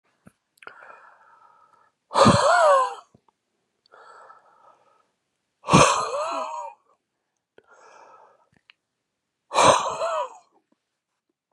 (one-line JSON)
{"exhalation_length": "11.5 s", "exhalation_amplitude": 28034, "exhalation_signal_mean_std_ratio": 0.34, "survey_phase": "beta (2021-08-13 to 2022-03-07)", "age": "45-64", "gender": "Male", "wearing_mask": "No", "symptom_cough_any": true, "symptom_new_continuous_cough": true, "smoker_status": "Ex-smoker", "respiratory_condition_asthma": true, "respiratory_condition_other": false, "recruitment_source": "REACT", "submission_delay": "2 days", "covid_test_result": "Negative", "covid_test_method": "RT-qPCR", "influenza_a_test_result": "Unknown/Void", "influenza_b_test_result": "Unknown/Void"}